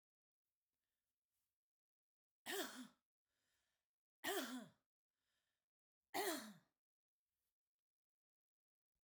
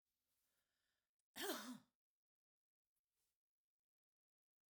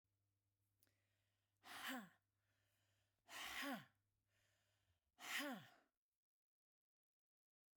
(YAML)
three_cough_length: 9.0 s
three_cough_amplitude: 950
three_cough_signal_mean_std_ratio: 0.27
cough_length: 4.7 s
cough_amplitude: 749
cough_signal_mean_std_ratio: 0.23
exhalation_length: 7.8 s
exhalation_amplitude: 625
exhalation_signal_mean_std_ratio: 0.35
survey_phase: beta (2021-08-13 to 2022-03-07)
age: 65+
gender: Female
wearing_mask: 'No'
symptom_none: true
smoker_status: Never smoked
respiratory_condition_asthma: false
respiratory_condition_other: false
recruitment_source: REACT
submission_delay: 1 day
covid_test_result: Negative
covid_test_method: RT-qPCR